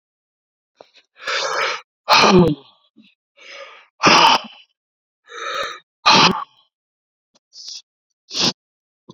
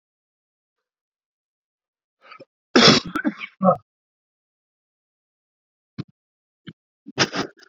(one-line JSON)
{"exhalation_length": "9.1 s", "exhalation_amplitude": 30760, "exhalation_signal_mean_std_ratio": 0.37, "cough_length": "7.7 s", "cough_amplitude": 31873, "cough_signal_mean_std_ratio": 0.23, "survey_phase": "beta (2021-08-13 to 2022-03-07)", "age": "45-64", "gender": "Male", "wearing_mask": "No", "symptom_cough_any": true, "symptom_shortness_of_breath": true, "symptom_sore_throat": true, "symptom_fatigue": true, "symptom_fever_high_temperature": true, "symptom_headache": true, "symptom_change_to_sense_of_smell_or_taste": true, "symptom_onset": "4 days", "smoker_status": "Never smoked", "respiratory_condition_asthma": false, "respiratory_condition_other": false, "recruitment_source": "Test and Trace", "submission_delay": "2 days", "covid_test_result": "Positive", "covid_test_method": "RT-qPCR", "covid_ct_value": 25.7, "covid_ct_gene": "N gene", "covid_ct_mean": 25.9, "covid_viral_load": "3200 copies/ml", "covid_viral_load_category": "Minimal viral load (< 10K copies/ml)"}